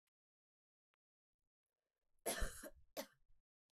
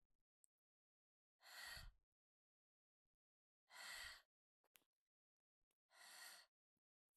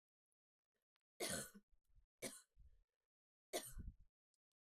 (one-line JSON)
{"cough_length": "3.8 s", "cough_amplitude": 1350, "cough_signal_mean_std_ratio": 0.26, "exhalation_length": "7.2 s", "exhalation_amplitude": 226, "exhalation_signal_mean_std_ratio": 0.36, "three_cough_length": "4.6 s", "three_cough_amplitude": 917, "three_cough_signal_mean_std_ratio": 0.34, "survey_phase": "beta (2021-08-13 to 2022-03-07)", "age": "18-44", "gender": "Female", "wearing_mask": "No", "symptom_cough_any": true, "symptom_runny_or_blocked_nose": true, "smoker_status": "Never smoked", "respiratory_condition_asthma": false, "respiratory_condition_other": false, "recruitment_source": "Test and Trace", "submission_delay": "1 day", "covid_test_result": "Negative", "covid_test_method": "RT-qPCR"}